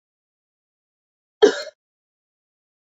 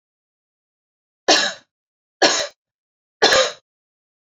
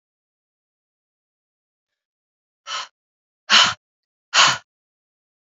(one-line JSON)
{"cough_length": "2.9 s", "cough_amplitude": 29417, "cough_signal_mean_std_ratio": 0.16, "three_cough_length": "4.4 s", "three_cough_amplitude": 29953, "three_cough_signal_mean_std_ratio": 0.32, "exhalation_length": "5.5 s", "exhalation_amplitude": 28720, "exhalation_signal_mean_std_ratio": 0.23, "survey_phase": "beta (2021-08-13 to 2022-03-07)", "age": "18-44", "gender": "Female", "wearing_mask": "No", "symptom_sore_throat": true, "symptom_headache": true, "smoker_status": "Never smoked", "respiratory_condition_asthma": false, "respiratory_condition_other": false, "recruitment_source": "Test and Trace", "submission_delay": "3 days", "covid_test_result": "Positive", "covid_test_method": "LFT"}